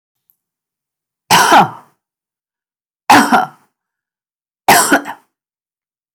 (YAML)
cough_length: 6.1 s
cough_amplitude: 32768
cough_signal_mean_std_ratio: 0.34
survey_phase: beta (2021-08-13 to 2022-03-07)
age: 65+
gender: Female
wearing_mask: 'No'
symptom_fatigue: true
smoker_status: Never smoked
respiratory_condition_asthma: false
respiratory_condition_other: false
recruitment_source: REACT
submission_delay: 2 days
covid_test_result: Negative
covid_test_method: RT-qPCR
influenza_a_test_result: Negative
influenza_b_test_result: Negative